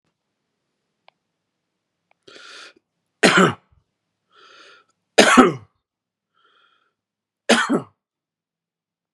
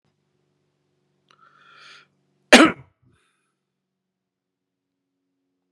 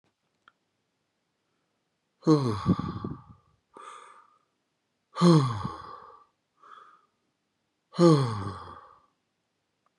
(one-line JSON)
{"three_cough_length": "9.1 s", "three_cough_amplitude": 32768, "three_cough_signal_mean_std_ratio": 0.24, "cough_length": "5.7 s", "cough_amplitude": 32768, "cough_signal_mean_std_ratio": 0.14, "exhalation_length": "10.0 s", "exhalation_amplitude": 14717, "exhalation_signal_mean_std_ratio": 0.31, "survey_phase": "beta (2021-08-13 to 2022-03-07)", "age": "45-64", "gender": "Male", "wearing_mask": "No", "symptom_none": true, "smoker_status": "Never smoked", "respiratory_condition_asthma": true, "respiratory_condition_other": false, "recruitment_source": "REACT", "submission_delay": "0 days", "covid_test_result": "Negative", "covid_test_method": "RT-qPCR", "influenza_a_test_result": "Unknown/Void", "influenza_b_test_result": "Unknown/Void"}